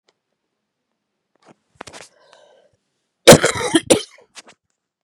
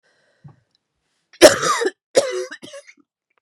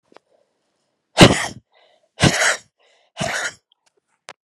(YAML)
cough_length: 5.0 s
cough_amplitude: 32768
cough_signal_mean_std_ratio: 0.21
three_cough_length: 3.4 s
three_cough_amplitude: 32768
three_cough_signal_mean_std_ratio: 0.29
exhalation_length: 4.4 s
exhalation_amplitude: 32768
exhalation_signal_mean_std_ratio: 0.29
survey_phase: beta (2021-08-13 to 2022-03-07)
age: 18-44
gender: Female
wearing_mask: 'No'
symptom_cough_any: true
symptom_runny_or_blocked_nose: true
symptom_sore_throat: true
symptom_diarrhoea: true
symptom_fatigue: true
symptom_headache: true
symptom_onset: 11 days
smoker_status: Never smoked
respiratory_condition_asthma: false
respiratory_condition_other: false
recruitment_source: Test and Trace
submission_delay: 2 days
covid_test_method: RT-qPCR